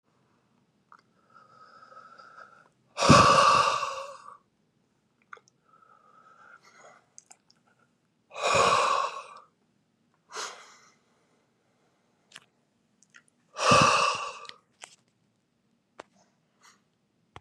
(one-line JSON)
{"exhalation_length": "17.4 s", "exhalation_amplitude": 18892, "exhalation_signal_mean_std_ratio": 0.3, "survey_phase": "beta (2021-08-13 to 2022-03-07)", "age": "18-44", "gender": "Male", "wearing_mask": "No", "symptom_cough_any": true, "symptom_runny_or_blocked_nose": true, "symptom_sore_throat": true, "symptom_abdominal_pain": true, "symptom_diarrhoea": true, "symptom_fatigue": true, "symptom_change_to_sense_of_smell_or_taste": true, "symptom_other": true, "symptom_onset": "4 days", "smoker_status": "Current smoker (11 or more cigarettes per day)", "respiratory_condition_asthma": false, "respiratory_condition_other": false, "recruitment_source": "Test and Trace", "submission_delay": "1 day", "covid_test_result": "Positive", "covid_test_method": "RT-qPCR", "covid_ct_value": 31.2, "covid_ct_gene": "N gene"}